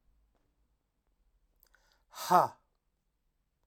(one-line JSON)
{"exhalation_length": "3.7 s", "exhalation_amplitude": 11652, "exhalation_signal_mean_std_ratio": 0.18, "survey_phase": "alpha (2021-03-01 to 2021-08-12)", "age": "18-44", "gender": "Male", "wearing_mask": "No", "symptom_cough_any": true, "symptom_shortness_of_breath": true, "symptom_onset": "8 days", "smoker_status": "Ex-smoker", "respiratory_condition_asthma": true, "respiratory_condition_other": false, "recruitment_source": "Test and Trace", "submission_delay": "1 day", "covid_test_result": "Positive", "covid_test_method": "RT-qPCR", "covid_ct_value": 17.2, "covid_ct_gene": "ORF1ab gene", "covid_ct_mean": 17.3, "covid_viral_load": "2100000 copies/ml", "covid_viral_load_category": "High viral load (>1M copies/ml)"}